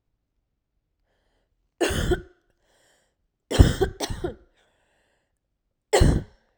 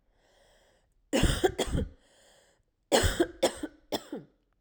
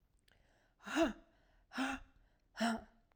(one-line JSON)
{"three_cough_length": "6.6 s", "three_cough_amplitude": 32767, "three_cough_signal_mean_std_ratio": 0.29, "cough_length": "4.6 s", "cough_amplitude": 13577, "cough_signal_mean_std_ratio": 0.4, "exhalation_length": "3.2 s", "exhalation_amplitude": 2697, "exhalation_signal_mean_std_ratio": 0.39, "survey_phase": "beta (2021-08-13 to 2022-03-07)", "age": "45-64", "gender": "Female", "wearing_mask": "No", "symptom_runny_or_blocked_nose": true, "symptom_fatigue": true, "symptom_fever_high_temperature": true, "symptom_headache": true, "symptom_onset": "3 days", "smoker_status": "Ex-smoker", "respiratory_condition_asthma": false, "respiratory_condition_other": false, "recruitment_source": "Test and Trace", "submission_delay": "2 days", "covid_test_result": "Positive", "covid_test_method": "ePCR"}